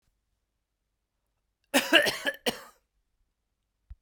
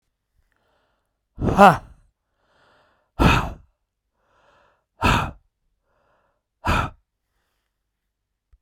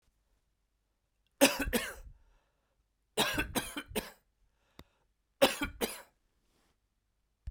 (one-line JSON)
{"cough_length": "4.0 s", "cough_amplitude": 20511, "cough_signal_mean_std_ratio": 0.26, "exhalation_length": "8.6 s", "exhalation_amplitude": 32767, "exhalation_signal_mean_std_ratio": 0.26, "three_cough_length": "7.5 s", "three_cough_amplitude": 11372, "three_cough_signal_mean_std_ratio": 0.3, "survey_phase": "beta (2021-08-13 to 2022-03-07)", "age": "45-64", "gender": "Male", "wearing_mask": "No", "symptom_none": true, "smoker_status": "Never smoked", "respiratory_condition_asthma": false, "respiratory_condition_other": false, "recruitment_source": "REACT", "submission_delay": "2 days", "covid_test_result": "Negative", "covid_test_method": "RT-qPCR"}